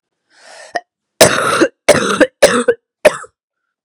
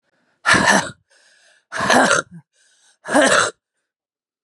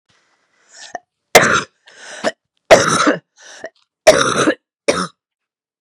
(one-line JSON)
{"cough_length": "3.8 s", "cough_amplitude": 32768, "cough_signal_mean_std_ratio": 0.43, "exhalation_length": "4.4 s", "exhalation_amplitude": 32767, "exhalation_signal_mean_std_ratio": 0.44, "three_cough_length": "5.8 s", "three_cough_amplitude": 32768, "three_cough_signal_mean_std_ratio": 0.37, "survey_phase": "beta (2021-08-13 to 2022-03-07)", "age": "45-64", "gender": "Female", "wearing_mask": "No", "symptom_new_continuous_cough": true, "symptom_runny_or_blocked_nose": true, "symptom_shortness_of_breath": true, "symptom_sore_throat": true, "symptom_abdominal_pain": true, "symptom_diarrhoea": true, "symptom_fatigue": true, "symptom_fever_high_temperature": true, "symptom_headache": true, "symptom_onset": "5 days", "smoker_status": "Never smoked", "respiratory_condition_asthma": false, "respiratory_condition_other": false, "recruitment_source": "Test and Trace", "submission_delay": "2 days", "covid_test_result": "Positive", "covid_test_method": "RT-qPCR", "covid_ct_value": 24.1, "covid_ct_gene": "ORF1ab gene", "covid_ct_mean": 24.1, "covid_viral_load": "12000 copies/ml", "covid_viral_load_category": "Low viral load (10K-1M copies/ml)"}